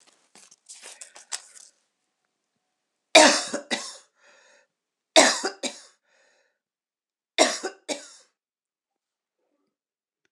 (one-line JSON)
{"three_cough_length": "10.3 s", "three_cough_amplitude": 26028, "three_cough_signal_mean_std_ratio": 0.23, "survey_phase": "beta (2021-08-13 to 2022-03-07)", "age": "65+", "gender": "Female", "wearing_mask": "No", "symptom_runny_or_blocked_nose": true, "smoker_status": "Ex-smoker", "respiratory_condition_asthma": false, "respiratory_condition_other": false, "recruitment_source": "REACT", "submission_delay": "11 days", "covid_test_result": "Negative", "covid_test_method": "RT-qPCR", "influenza_a_test_result": "Negative", "influenza_b_test_result": "Negative"}